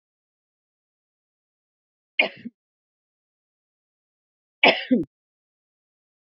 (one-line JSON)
{"three_cough_length": "6.2 s", "three_cough_amplitude": 30207, "three_cough_signal_mean_std_ratio": 0.18, "survey_phase": "beta (2021-08-13 to 2022-03-07)", "age": "65+", "gender": "Female", "wearing_mask": "No", "symptom_cough_any": true, "symptom_runny_or_blocked_nose": true, "symptom_sore_throat": true, "symptom_fatigue": true, "symptom_onset": "3 days", "smoker_status": "Ex-smoker", "respiratory_condition_asthma": false, "respiratory_condition_other": false, "recruitment_source": "Test and Trace", "submission_delay": "1 day", "covid_test_result": "Positive", "covid_test_method": "RT-qPCR", "covid_ct_value": 21.4, "covid_ct_gene": "ORF1ab gene"}